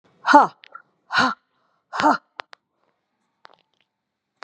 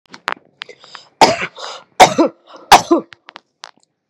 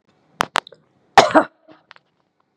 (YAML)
exhalation_length: 4.4 s
exhalation_amplitude: 29879
exhalation_signal_mean_std_ratio: 0.27
three_cough_length: 4.1 s
three_cough_amplitude: 32768
three_cough_signal_mean_std_ratio: 0.31
cough_length: 2.6 s
cough_amplitude: 32768
cough_signal_mean_std_ratio: 0.22
survey_phase: beta (2021-08-13 to 2022-03-07)
age: 45-64
gender: Female
wearing_mask: 'No'
symptom_none: true
smoker_status: Never smoked
respiratory_condition_asthma: false
respiratory_condition_other: false
recruitment_source: REACT
submission_delay: 2 days
covid_test_result: Negative
covid_test_method: RT-qPCR
influenza_a_test_result: Negative
influenza_b_test_result: Negative